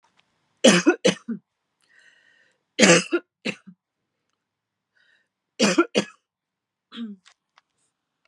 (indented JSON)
{
  "three_cough_length": "8.3 s",
  "three_cough_amplitude": 31422,
  "three_cough_signal_mean_std_ratio": 0.28,
  "survey_phase": "beta (2021-08-13 to 2022-03-07)",
  "age": "18-44",
  "gender": "Female",
  "wearing_mask": "No",
  "symptom_cough_any": true,
  "symptom_onset": "5 days",
  "smoker_status": "Never smoked",
  "respiratory_condition_asthma": false,
  "respiratory_condition_other": false,
  "recruitment_source": "REACT",
  "submission_delay": "2 days",
  "covid_test_result": "Negative",
  "covid_test_method": "RT-qPCR",
  "influenza_a_test_result": "Unknown/Void",
  "influenza_b_test_result": "Unknown/Void"
}